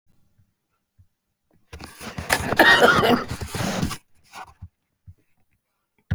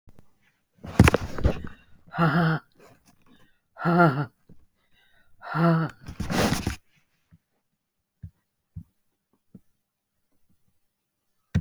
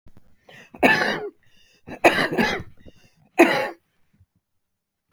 {"cough_length": "6.1 s", "cough_amplitude": 28519, "cough_signal_mean_std_ratio": 0.37, "exhalation_length": "11.6 s", "exhalation_amplitude": 30497, "exhalation_signal_mean_std_ratio": 0.35, "three_cough_length": "5.1 s", "three_cough_amplitude": 32075, "three_cough_signal_mean_std_ratio": 0.37, "survey_phase": "beta (2021-08-13 to 2022-03-07)", "age": "65+", "gender": "Female", "wearing_mask": "No", "symptom_cough_any": true, "symptom_change_to_sense_of_smell_or_taste": true, "symptom_onset": "12 days", "smoker_status": "Never smoked", "respiratory_condition_asthma": false, "respiratory_condition_other": false, "recruitment_source": "REACT", "submission_delay": "2 days", "covid_test_result": "Negative", "covid_test_method": "RT-qPCR"}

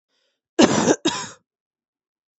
{"cough_length": "2.4 s", "cough_amplitude": 32767, "cough_signal_mean_std_ratio": 0.34, "survey_phase": "beta (2021-08-13 to 2022-03-07)", "age": "18-44", "gender": "Female", "wearing_mask": "No", "symptom_cough_any": true, "symptom_new_continuous_cough": true, "symptom_runny_or_blocked_nose": true, "symptom_sore_throat": true, "symptom_fatigue": true, "symptom_headache": true, "symptom_change_to_sense_of_smell_or_taste": true, "symptom_loss_of_taste": true, "symptom_onset": "4 days", "smoker_status": "Never smoked", "respiratory_condition_asthma": false, "respiratory_condition_other": false, "recruitment_source": "Test and Trace", "submission_delay": "1 day", "covid_test_result": "Positive", "covid_test_method": "RT-qPCR", "covid_ct_value": 17.7, "covid_ct_gene": "N gene"}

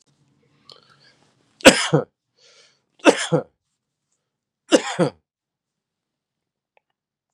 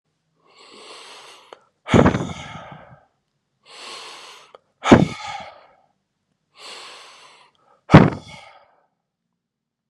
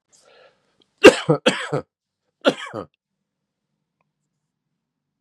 {"three_cough_length": "7.3 s", "three_cough_amplitude": 32768, "three_cough_signal_mean_std_ratio": 0.22, "exhalation_length": "9.9 s", "exhalation_amplitude": 32768, "exhalation_signal_mean_std_ratio": 0.23, "cough_length": "5.2 s", "cough_amplitude": 32768, "cough_signal_mean_std_ratio": 0.2, "survey_phase": "beta (2021-08-13 to 2022-03-07)", "age": "65+", "gender": "Female", "wearing_mask": "No", "symptom_cough_any": true, "symptom_runny_or_blocked_nose": true, "symptom_sore_throat": true, "symptom_fatigue": true, "symptom_fever_high_temperature": true, "symptom_headache": true, "smoker_status": "Ex-smoker", "respiratory_condition_asthma": false, "respiratory_condition_other": false, "recruitment_source": "Test and Trace", "submission_delay": "1 day", "covid_test_result": "Negative", "covid_test_method": "RT-qPCR"}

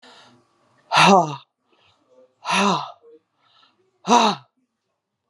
{"exhalation_length": "5.3 s", "exhalation_amplitude": 30777, "exhalation_signal_mean_std_ratio": 0.34, "survey_phase": "alpha (2021-03-01 to 2021-08-12)", "age": "45-64", "gender": "Female", "wearing_mask": "No", "symptom_cough_any": true, "symptom_abdominal_pain": true, "symptom_diarrhoea": true, "symptom_fatigue": true, "symptom_headache": true, "symptom_change_to_sense_of_smell_or_taste": true, "symptom_loss_of_taste": true, "smoker_status": "Current smoker (11 or more cigarettes per day)", "respiratory_condition_asthma": false, "respiratory_condition_other": false, "recruitment_source": "Test and Trace", "submission_delay": "1 day", "covid_test_result": "Positive", "covid_test_method": "RT-qPCR", "covid_ct_value": 16.5, "covid_ct_gene": "ORF1ab gene", "covid_ct_mean": 18.4, "covid_viral_load": "920000 copies/ml", "covid_viral_load_category": "Low viral load (10K-1M copies/ml)"}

